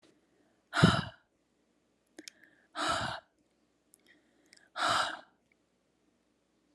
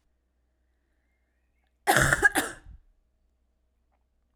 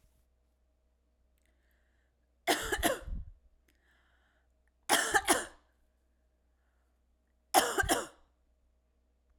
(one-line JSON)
{"exhalation_length": "6.7 s", "exhalation_amplitude": 13134, "exhalation_signal_mean_std_ratio": 0.29, "cough_length": "4.4 s", "cough_amplitude": 18124, "cough_signal_mean_std_ratio": 0.26, "three_cough_length": "9.4 s", "three_cough_amplitude": 13458, "three_cough_signal_mean_std_ratio": 0.3, "survey_phase": "alpha (2021-03-01 to 2021-08-12)", "age": "18-44", "gender": "Female", "wearing_mask": "No", "symptom_diarrhoea": true, "symptom_fatigue": true, "symptom_headache": true, "smoker_status": "Never smoked", "respiratory_condition_asthma": false, "respiratory_condition_other": false, "recruitment_source": "Test and Trace", "submission_delay": "2 days", "covid_test_result": "Positive", "covid_test_method": "RT-qPCR", "covid_ct_value": 20.6, "covid_ct_gene": "ORF1ab gene", "covid_ct_mean": 20.9, "covid_viral_load": "140000 copies/ml", "covid_viral_load_category": "Low viral load (10K-1M copies/ml)"}